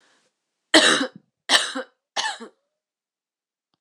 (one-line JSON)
{"three_cough_length": "3.8 s", "three_cough_amplitude": 26028, "three_cough_signal_mean_std_ratio": 0.32, "survey_phase": "beta (2021-08-13 to 2022-03-07)", "age": "45-64", "gender": "Female", "wearing_mask": "No", "symptom_cough_any": true, "symptom_sore_throat": true, "symptom_onset": "3 days", "smoker_status": "Never smoked", "respiratory_condition_asthma": false, "respiratory_condition_other": false, "recruitment_source": "Test and Trace", "submission_delay": "2 days", "covid_test_result": "Positive", "covid_test_method": "RT-qPCR"}